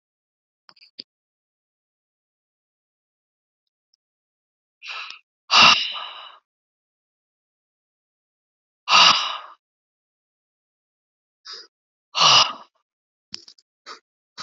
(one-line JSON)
{"exhalation_length": "14.4 s", "exhalation_amplitude": 29733, "exhalation_signal_mean_std_ratio": 0.23, "survey_phase": "beta (2021-08-13 to 2022-03-07)", "age": "45-64", "gender": "Female", "wearing_mask": "No", "symptom_none": true, "smoker_status": "Never smoked", "respiratory_condition_asthma": false, "respiratory_condition_other": false, "recruitment_source": "REACT", "submission_delay": "1 day", "covid_test_result": "Negative", "covid_test_method": "RT-qPCR", "influenza_a_test_result": "Negative", "influenza_b_test_result": "Negative"}